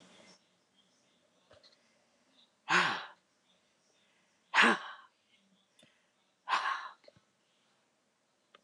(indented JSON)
{
  "exhalation_length": "8.6 s",
  "exhalation_amplitude": 9684,
  "exhalation_signal_mean_std_ratio": 0.26,
  "survey_phase": "alpha (2021-03-01 to 2021-08-12)",
  "age": "65+",
  "gender": "Female",
  "wearing_mask": "No",
  "symptom_none": true,
  "smoker_status": "Never smoked",
  "respiratory_condition_asthma": false,
  "respiratory_condition_other": false,
  "recruitment_source": "REACT",
  "submission_delay": "2 days",
  "covid_test_result": "Negative",
  "covid_test_method": "RT-qPCR"
}